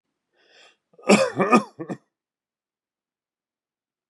{"cough_length": "4.1 s", "cough_amplitude": 25854, "cough_signal_mean_std_ratio": 0.26, "survey_phase": "beta (2021-08-13 to 2022-03-07)", "age": "45-64", "gender": "Male", "wearing_mask": "No", "symptom_none": true, "smoker_status": "Ex-smoker", "respiratory_condition_asthma": false, "respiratory_condition_other": false, "recruitment_source": "REACT", "submission_delay": "1 day", "covid_test_result": "Negative", "covid_test_method": "RT-qPCR", "influenza_a_test_result": "Negative", "influenza_b_test_result": "Negative"}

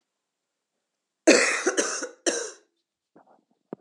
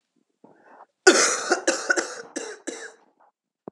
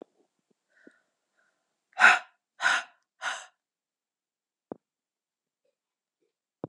{"three_cough_length": "3.8 s", "three_cough_amplitude": 21694, "three_cough_signal_mean_std_ratio": 0.34, "cough_length": "3.7 s", "cough_amplitude": 30922, "cough_signal_mean_std_ratio": 0.37, "exhalation_length": "6.7 s", "exhalation_amplitude": 19739, "exhalation_signal_mean_std_ratio": 0.19, "survey_phase": "beta (2021-08-13 to 2022-03-07)", "age": "18-44", "gender": "Female", "wearing_mask": "No", "symptom_cough_any": true, "symptom_runny_or_blocked_nose": true, "symptom_fever_high_temperature": true, "symptom_change_to_sense_of_smell_or_taste": true, "symptom_onset": "3 days", "smoker_status": "Ex-smoker", "respiratory_condition_asthma": false, "respiratory_condition_other": false, "recruitment_source": "Test and Trace", "submission_delay": "2 days", "covid_test_result": "Positive", "covid_test_method": "RT-qPCR", "covid_ct_value": 32.6, "covid_ct_gene": "ORF1ab gene", "covid_ct_mean": 34.7, "covid_viral_load": "4.1 copies/ml", "covid_viral_load_category": "Minimal viral load (< 10K copies/ml)"}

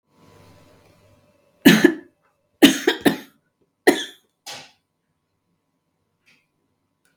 {"three_cough_length": "7.2 s", "three_cough_amplitude": 32768, "three_cough_signal_mean_std_ratio": 0.23, "survey_phase": "beta (2021-08-13 to 2022-03-07)", "age": "65+", "gender": "Female", "wearing_mask": "No", "symptom_none": true, "smoker_status": "Ex-smoker", "respiratory_condition_asthma": false, "respiratory_condition_other": false, "recruitment_source": "REACT", "submission_delay": "2 days", "covid_test_result": "Negative", "covid_test_method": "RT-qPCR", "influenza_a_test_result": "Unknown/Void", "influenza_b_test_result": "Unknown/Void"}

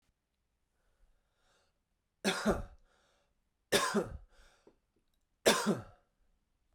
{"three_cough_length": "6.7 s", "three_cough_amplitude": 7504, "three_cough_signal_mean_std_ratio": 0.3, "survey_phase": "beta (2021-08-13 to 2022-03-07)", "age": "18-44", "gender": "Male", "wearing_mask": "No", "symptom_cough_any": true, "symptom_runny_or_blocked_nose": true, "symptom_fatigue": true, "symptom_headache": true, "symptom_onset": "4 days", "smoker_status": "Ex-smoker", "respiratory_condition_asthma": true, "respiratory_condition_other": false, "recruitment_source": "Test and Trace", "submission_delay": "2 days", "covid_test_result": "Positive", "covid_test_method": "RT-qPCR", "covid_ct_value": 12.9, "covid_ct_gene": "ORF1ab gene", "covid_ct_mean": 13.3, "covid_viral_load": "43000000 copies/ml", "covid_viral_load_category": "High viral load (>1M copies/ml)"}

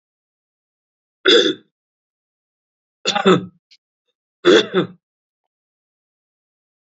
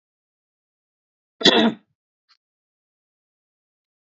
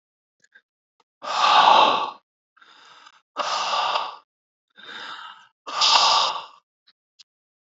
{"three_cough_length": "6.8 s", "three_cough_amplitude": 28708, "three_cough_signal_mean_std_ratio": 0.28, "cough_length": "4.0 s", "cough_amplitude": 28174, "cough_signal_mean_std_ratio": 0.2, "exhalation_length": "7.7 s", "exhalation_amplitude": 25760, "exhalation_signal_mean_std_ratio": 0.43, "survey_phase": "beta (2021-08-13 to 2022-03-07)", "age": "45-64", "gender": "Male", "wearing_mask": "No", "symptom_cough_any": true, "symptom_sore_throat": true, "smoker_status": "Ex-smoker", "respiratory_condition_asthma": false, "respiratory_condition_other": false, "recruitment_source": "Test and Trace", "submission_delay": "2 days", "covid_test_result": "Positive", "covid_test_method": "RT-qPCR", "covid_ct_value": 34.4, "covid_ct_gene": "N gene"}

